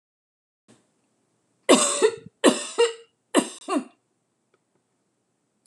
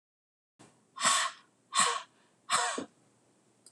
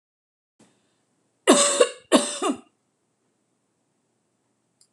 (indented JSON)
{
  "three_cough_length": "5.7 s",
  "three_cough_amplitude": 24915,
  "three_cough_signal_mean_std_ratio": 0.31,
  "exhalation_length": "3.7 s",
  "exhalation_amplitude": 7911,
  "exhalation_signal_mean_std_ratio": 0.4,
  "cough_length": "4.9 s",
  "cough_amplitude": 25721,
  "cough_signal_mean_std_ratio": 0.28,
  "survey_phase": "beta (2021-08-13 to 2022-03-07)",
  "age": "45-64",
  "gender": "Female",
  "wearing_mask": "No",
  "symptom_none": true,
  "smoker_status": "Ex-smoker",
  "respiratory_condition_asthma": false,
  "respiratory_condition_other": false,
  "recruitment_source": "REACT",
  "submission_delay": "3 days",
  "covid_test_result": "Negative",
  "covid_test_method": "RT-qPCR"
}